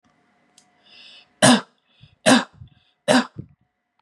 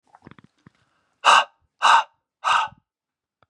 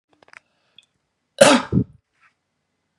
{"three_cough_length": "4.0 s", "three_cough_amplitude": 29582, "three_cough_signal_mean_std_ratio": 0.29, "exhalation_length": "3.5 s", "exhalation_amplitude": 27870, "exhalation_signal_mean_std_ratio": 0.33, "cough_length": "3.0 s", "cough_amplitude": 32768, "cough_signal_mean_std_ratio": 0.25, "survey_phase": "beta (2021-08-13 to 2022-03-07)", "age": "18-44", "gender": "Male", "wearing_mask": "No", "symptom_none": true, "smoker_status": "Never smoked", "respiratory_condition_asthma": false, "respiratory_condition_other": false, "recruitment_source": "REACT", "submission_delay": "3 days", "covid_test_result": "Negative", "covid_test_method": "RT-qPCR", "influenza_a_test_result": "Negative", "influenza_b_test_result": "Negative"}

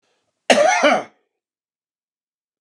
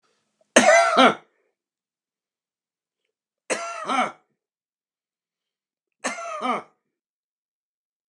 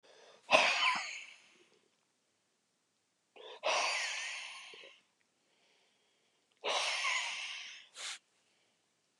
{"cough_length": "2.6 s", "cough_amplitude": 32767, "cough_signal_mean_std_ratio": 0.36, "three_cough_length": "8.1 s", "three_cough_amplitude": 31127, "three_cough_signal_mean_std_ratio": 0.29, "exhalation_length": "9.2 s", "exhalation_amplitude": 11818, "exhalation_signal_mean_std_ratio": 0.42, "survey_phase": "beta (2021-08-13 to 2022-03-07)", "age": "65+", "gender": "Male", "wearing_mask": "No", "symptom_none": true, "smoker_status": "Ex-smoker", "respiratory_condition_asthma": false, "respiratory_condition_other": false, "recruitment_source": "REACT", "submission_delay": "-1 day", "covid_test_result": "Negative", "covid_test_method": "RT-qPCR"}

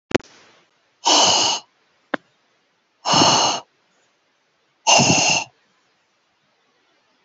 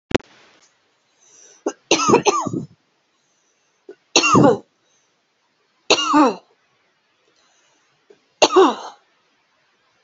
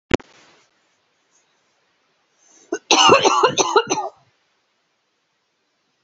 {"exhalation_length": "7.2 s", "exhalation_amplitude": 29854, "exhalation_signal_mean_std_ratio": 0.4, "three_cough_length": "10.0 s", "three_cough_amplitude": 32767, "three_cough_signal_mean_std_ratio": 0.33, "cough_length": "6.0 s", "cough_amplitude": 30404, "cough_signal_mean_std_ratio": 0.32, "survey_phase": "beta (2021-08-13 to 2022-03-07)", "age": "18-44", "gender": "Female", "wearing_mask": "No", "symptom_none": true, "smoker_status": "Never smoked", "respiratory_condition_asthma": true, "respiratory_condition_other": false, "recruitment_source": "REACT", "submission_delay": "1 day", "covid_test_result": "Negative", "covid_test_method": "RT-qPCR"}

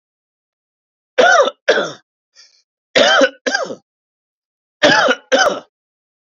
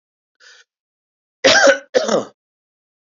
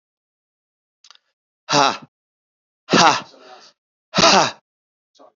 {"three_cough_length": "6.2 s", "three_cough_amplitude": 29913, "three_cough_signal_mean_std_ratio": 0.42, "cough_length": "3.2 s", "cough_amplitude": 32767, "cough_signal_mean_std_ratio": 0.34, "exhalation_length": "5.4 s", "exhalation_amplitude": 31710, "exhalation_signal_mean_std_ratio": 0.31, "survey_phase": "beta (2021-08-13 to 2022-03-07)", "age": "45-64", "gender": "Male", "wearing_mask": "No", "symptom_runny_or_blocked_nose": true, "symptom_fatigue": true, "symptom_onset": "3 days", "smoker_status": "Ex-smoker", "respiratory_condition_asthma": false, "respiratory_condition_other": false, "recruitment_source": "REACT", "submission_delay": "4 days", "covid_test_result": "Negative", "covid_test_method": "RT-qPCR", "influenza_a_test_result": "Negative", "influenza_b_test_result": "Negative"}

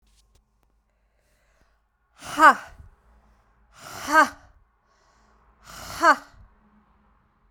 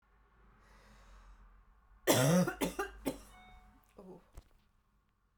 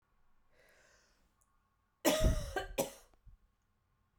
{"exhalation_length": "7.5 s", "exhalation_amplitude": 28440, "exhalation_signal_mean_std_ratio": 0.22, "three_cough_length": "5.4 s", "three_cough_amplitude": 7492, "three_cough_signal_mean_std_ratio": 0.34, "cough_length": "4.2 s", "cough_amplitude": 5345, "cough_signal_mean_std_ratio": 0.32, "survey_phase": "beta (2021-08-13 to 2022-03-07)", "age": "18-44", "gender": "Female", "wearing_mask": "No", "symptom_cough_any": true, "symptom_fatigue": true, "symptom_other": true, "smoker_status": "Ex-smoker", "respiratory_condition_asthma": false, "respiratory_condition_other": false, "recruitment_source": "Test and Trace", "submission_delay": "3 days", "covid_test_result": "Positive", "covid_test_method": "RT-qPCR", "covid_ct_value": 35.3, "covid_ct_gene": "ORF1ab gene"}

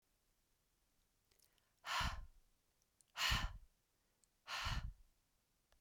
{"exhalation_length": "5.8 s", "exhalation_amplitude": 1861, "exhalation_signal_mean_std_ratio": 0.37, "survey_phase": "beta (2021-08-13 to 2022-03-07)", "age": "18-44", "gender": "Female", "wearing_mask": "No", "symptom_none": true, "smoker_status": "Never smoked", "respiratory_condition_asthma": false, "respiratory_condition_other": false, "recruitment_source": "REACT", "submission_delay": "1 day", "covid_test_result": "Negative", "covid_test_method": "RT-qPCR"}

